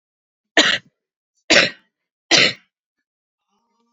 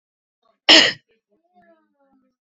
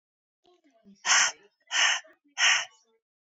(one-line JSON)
{"three_cough_length": "3.9 s", "three_cough_amplitude": 32184, "three_cough_signal_mean_std_ratio": 0.3, "cough_length": "2.6 s", "cough_amplitude": 29325, "cough_signal_mean_std_ratio": 0.23, "exhalation_length": "3.2 s", "exhalation_amplitude": 11203, "exhalation_signal_mean_std_ratio": 0.4, "survey_phase": "beta (2021-08-13 to 2022-03-07)", "age": "18-44", "gender": "Female", "wearing_mask": "No", "symptom_cough_any": true, "symptom_onset": "5 days", "smoker_status": "Current smoker (1 to 10 cigarettes per day)", "respiratory_condition_asthma": false, "respiratory_condition_other": false, "recruitment_source": "REACT", "submission_delay": "2 days", "covid_test_result": "Negative", "covid_test_method": "RT-qPCR"}